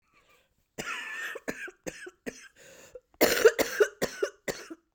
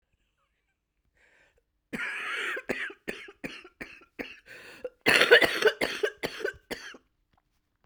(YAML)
three_cough_length: 4.9 s
three_cough_amplitude: 18325
three_cough_signal_mean_std_ratio: 0.36
cough_length: 7.9 s
cough_amplitude: 25797
cough_signal_mean_std_ratio: 0.34
survey_phase: beta (2021-08-13 to 2022-03-07)
age: 45-64
gender: Female
wearing_mask: 'No'
symptom_cough_any: true
symptom_new_continuous_cough: true
symptom_runny_or_blocked_nose: true
symptom_shortness_of_breath: true
symptom_fatigue: true
symptom_headache: true
symptom_other: true
symptom_onset: 3 days
smoker_status: Never smoked
respiratory_condition_asthma: true
respiratory_condition_other: false
recruitment_source: Test and Trace
submission_delay: 2 days
covid_test_result: Positive
covid_test_method: RT-qPCR
covid_ct_value: 14.5
covid_ct_gene: S gene
covid_ct_mean: 15.4
covid_viral_load: 9100000 copies/ml
covid_viral_load_category: High viral load (>1M copies/ml)